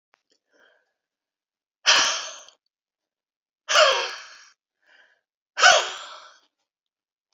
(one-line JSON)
{"exhalation_length": "7.3 s", "exhalation_amplitude": 26529, "exhalation_signal_mean_std_ratio": 0.3, "survey_phase": "beta (2021-08-13 to 2022-03-07)", "age": "65+", "gender": "Female", "wearing_mask": "No", "symptom_none": true, "smoker_status": "Ex-smoker", "respiratory_condition_asthma": false, "respiratory_condition_other": false, "recruitment_source": "REACT", "submission_delay": "1 day", "covid_test_result": "Negative", "covid_test_method": "RT-qPCR"}